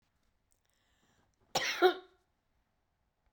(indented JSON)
{
  "cough_length": "3.3 s",
  "cough_amplitude": 7079,
  "cough_signal_mean_std_ratio": 0.23,
  "survey_phase": "beta (2021-08-13 to 2022-03-07)",
  "age": "65+",
  "gender": "Male",
  "wearing_mask": "No",
  "symptom_fatigue": true,
  "symptom_change_to_sense_of_smell_or_taste": true,
  "smoker_status": "Never smoked",
  "respiratory_condition_asthma": true,
  "respiratory_condition_other": false,
  "recruitment_source": "Test and Trace",
  "submission_delay": "1 day",
  "covid_test_result": "Negative",
  "covid_test_method": "ePCR"
}